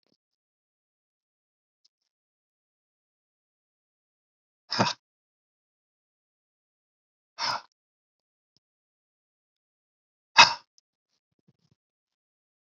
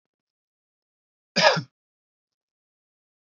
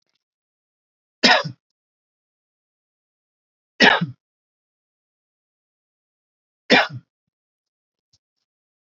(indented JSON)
{
  "exhalation_length": "12.6 s",
  "exhalation_amplitude": 29739,
  "exhalation_signal_mean_std_ratio": 0.12,
  "cough_length": "3.2 s",
  "cough_amplitude": 25995,
  "cough_signal_mean_std_ratio": 0.2,
  "three_cough_length": "9.0 s",
  "three_cough_amplitude": 32338,
  "three_cough_signal_mean_std_ratio": 0.2,
  "survey_phase": "beta (2021-08-13 to 2022-03-07)",
  "age": "45-64",
  "gender": "Male",
  "wearing_mask": "No",
  "symptom_none": true,
  "smoker_status": "Never smoked",
  "respiratory_condition_asthma": false,
  "respiratory_condition_other": false,
  "recruitment_source": "REACT",
  "submission_delay": "4 days",
  "covid_test_result": "Negative",
  "covid_test_method": "RT-qPCR"
}